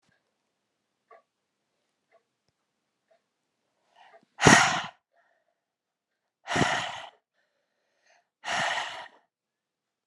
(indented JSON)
{
  "exhalation_length": "10.1 s",
  "exhalation_amplitude": 26197,
  "exhalation_signal_mean_std_ratio": 0.24,
  "survey_phase": "alpha (2021-03-01 to 2021-08-12)",
  "age": "18-44",
  "gender": "Female",
  "wearing_mask": "No",
  "symptom_none": true,
  "smoker_status": "Ex-smoker",
  "respiratory_condition_asthma": true,
  "respiratory_condition_other": false,
  "recruitment_source": "REACT",
  "submission_delay": "3 days",
  "covid_test_result": "Negative",
  "covid_test_method": "RT-qPCR"
}